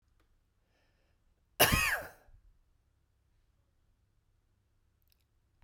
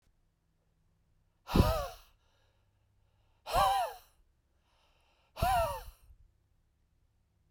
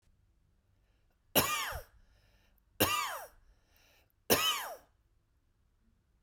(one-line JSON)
{"cough_length": "5.6 s", "cough_amplitude": 11377, "cough_signal_mean_std_ratio": 0.22, "exhalation_length": "7.5 s", "exhalation_amplitude": 9058, "exhalation_signal_mean_std_ratio": 0.32, "three_cough_length": "6.2 s", "three_cough_amplitude": 9587, "three_cough_signal_mean_std_ratio": 0.34, "survey_phase": "beta (2021-08-13 to 2022-03-07)", "age": "45-64", "gender": "Male", "wearing_mask": "No", "symptom_cough_any": true, "symptom_runny_or_blocked_nose": true, "symptom_headache": true, "symptom_change_to_sense_of_smell_or_taste": true, "symptom_loss_of_taste": true, "smoker_status": "Never smoked", "respiratory_condition_asthma": false, "respiratory_condition_other": false, "recruitment_source": "Test and Trace", "submission_delay": "1 day", "covid_test_result": "Positive", "covid_test_method": "RT-qPCR"}